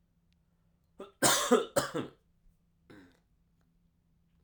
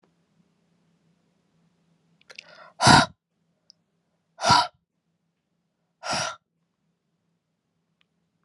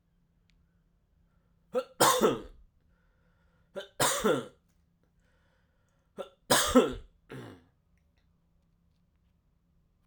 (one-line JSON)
{"cough_length": "4.4 s", "cough_amplitude": 8122, "cough_signal_mean_std_ratio": 0.29, "exhalation_length": "8.4 s", "exhalation_amplitude": 29207, "exhalation_signal_mean_std_ratio": 0.21, "three_cough_length": "10.1 s", "three_cough_amplitude": 13841, "three_cough_signal_mean_std_ratio": 0.29, "survey_phase": "alpha (2021-03-01 to 2021-08-12)", "age": "18-44", "gender": "Male", "wearing_mask": "No", "symptom_cough_any": true, "symptom_new_continuous_cough": true, "symptom_shortness_of_breath": true, "symptom_fatigue": true, "symptom_fever_high_temperature": true, "symptom_headache": true, "symptom_change_to_sense_of_smell_or_taste": true, "symptom_loss_of_taste": true, "symptom_onset": "3 days", "smoker_status": "Ex-smoker", "respiratory_condition_asthma": false, "respiratory_condition_other": false, "recruitment_source": "Test and Trace", "submission_delay": "2 days", "covid_test_result": "Positive", "covid_test_method": "RT-qPCR", "covid_ct_value": 18.8, "covid_ct_gene": "ORF1ab gene", "covid_ct_mean": 20.0, "covid_viral_load": "280000 copies/ml", "covid_viral_load_category": "Low viral load (10K-1M copies/ml)"}